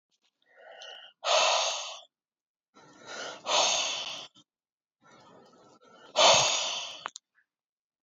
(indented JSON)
{
  "exhalation_length": "8.0 s",
  "exhalation_amplitude": 14412,
  "exhalation_signal_mean_std_ratio": 0.41,
  "survey_phase": "beta (2021-08-13 to 2022-03-07)",
  "age": "18-44",
  "gender": "Male",
  "wearing_mask": "No",
  "symptom_sore_throat": true,
  "symptom_abdominal_pain": true,
  "symptom_headache": true,
  "symptom_onset": "3 days",
  "smoker_status": "Ex-smoker",
  "respiratory_condition_asthma": false,
  "respiratory_condition_other": false,
  "recruitment_source": "Test and Trace",
  "submission_delay": "2 days",
  "covid_test_result": "Positive",
  "covid_test_method": "RT-qPCR",
  "covid_ct_value": 18.2,
  "covid_ct_gene": "N gene"
}